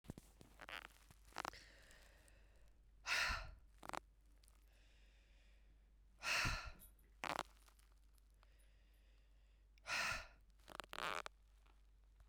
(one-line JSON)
{"exhalation_length": "12.3 s", "exhalation_amplitude": 2362, "exhalation_signal_mean_std_ratio": 0.39, "survey_phase": "beta (2021-08-13 to 2022-03-07)", "age": "45-64", "gender": "Female", "wearing_mask": "No", "symptom_cough_any": true, "symptom_runny_or_blocked_nose": true, "symptom_shortness_of_breath": true, "symptom_abdominal_pain": true, "symptom_fatigue": true, "symptom_fever_high_temperature": true, "symptom_change_to_sense_of_smell_or_taste": true, "symptom_loss_of_taste": true, "symptom_onset": "2 days", "smoker_status": "Ex-smoker", "respiratory_condition_asthma": false, "respiratory_condition_other": false, "recruitment_source": "Test and Trace", "submission_delay": "2 days", "covid_test_method": "RT-qPCR", "covid_ct_value": 20.6, "covid_ct_gene": "ORF1ab gene"}